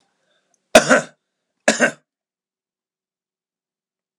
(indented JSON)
{
  "cough_length": "4.2 s",
  "cough_amplitude": 32768,
  "cough_signal_mean_std_ratio": 0.22,
  "survey_phase": "alpha (2021-03-01 to 2021-08-12)",
  "age": "65+",
  "gender": "Male",
  "wearing_mask": "No",
  "symptom_none": true,
  "smoker_status": "Never smoked",
  "respiratory_condition_asthma": false,
  "respiratory_condition_other": false,
  "recruitment_source": "REACT",
  "submission_delay": "1 day",
  "covid_test_result": "Negative",
  "covid_test_method": "RT-qPCR"
}